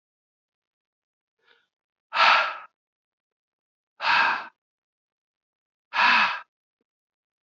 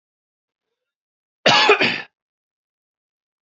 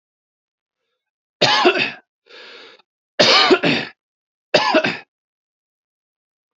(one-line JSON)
{"exhalation_length": "7.4 s", "exhalation_amplitude": 19597, "exhalation_signal_mean_std_ratio": 0.32, "cough_length": "3.4 s", "cough_amplitude": 29482, "cough_signal_mean_std_ratio": 0.3, "three_cough_length": "6.6 s", "three_cough_amplitude": 30211, "three_cough_signal_mean_std_ratio": 0.38, "survey_phase": "beta (2021-08-13 to 2022-03-07)", "age": "45-64", "gender": "Male", "wearing_mask": "No", "symptom_cough_any": true, "symptom_runny_or_blocked_nose": true, "symptom_sore_throat": true, "symptom_fatigue": true, "symptom_headache": true, "symptom_onset": "3 days", "smoker_status": "Never smoked", "respiratory_condition_asthma": false, "respiratory_condition_other": false, "recruitment_source": "Test and Trace", "submission_delay": "1 day", "covid_test_result": "Positive", "covid_test_method": "RT-qPCR", "covid_ct_value": 20.1, "covid_ct_gene": "N gene"}